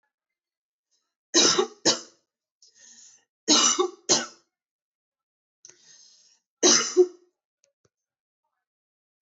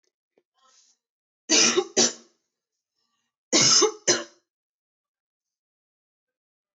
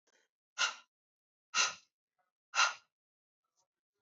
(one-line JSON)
{"three_cough_length": "9.2 s", "three_cough_amplitude": 18086, "three_cough_signal_mean_std_ratio": 0.3, "cough_length": "6.7 s", "cough_amplitude": 16690, "cough_signal_mean_std_ratio": 0.31, "exhalation_length": "4.0 s", "exhalation_amplitude": 5847, "exhalation_signal_mean_std_ratio": 0.26, "survey_phase": "beta (2021-08-13 to 2022-03-07)", "age": "18-44", "gender": "Female", "wearing_mask": "No", "symptom_cough_any": true, "symptom_runny_or_blocked_nose": true, "symptom_onset": "6 days", "smoker_status": "Never smoked", "respiratory_condition_asthma": false, "respiratory_condition_other": false, "recruitment_source": "REACT", "submission_delay": "4 days", "covid_test_result": "Negative", "covid_test_method": "RT-qPCR", "influenza_a_test_result": "Unknown/Void", "influenza_b_test_result": "Unknown/Void"}